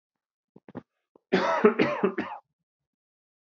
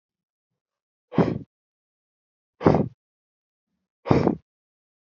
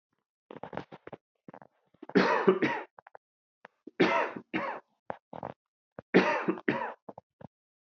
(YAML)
cough_length: 3.4 s
cough_amplitude: 19357
cough_signal_mean_std_ratio: 0.37
exhalation_length: 5.1 s
exhalation_amplitude: 27118
exhalation_signal_mean_std_ratio: 0.26
three_cough_length: 7.9 s
three_cough_amplitude: 13792
three_cough_signal_mean_std_ratio: 0.37
survey_phase: beta (2021-08-13 to 2022-03-07)
age: 45-64
gender: Male
wearing_mask: 'No'
symptom_none: true
smoker_status: Never smoked
respiratory_condition_asthma: false
respiratory_condition_other: false
recruitment_source: REACT
submission_delay: 2 days
covid_test_result: Negative
covid_test_method: RT-qPCR
influenza_a_test_result: Negative
influenza_b_test_result: Negative